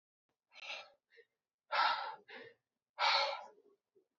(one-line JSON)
{"exhalation_length": "4.2 s", "exhalation_amplitude": 3889, "exhalation_signal_mean_std_ratio": 0.38, "survey_phase": "beta (2021-08-13 to 2022-03-07)", "age": "18-44", "gender": "Male", "wearing_mask": "No", "symptom_cough_any": true, "symptom_new_continuous_cough": true, "symptom_runny_or_blocked_nose": true, "symptom_shortness_of_breath": true, "symptom_sore_throat": true, "symptom_fever_high_temperature": true, "symptom_headache": true, "symptom_onset": "4 days", "smoker_status": "Never smoked", "respiratory_condition_asthma": false, "respiratory_condition_other": false, "recruitment_source": "Test and Trace", "submission_delay": "2 days", "covid_test_result": "Positive", "covid_test_method": "RT-qPCR"}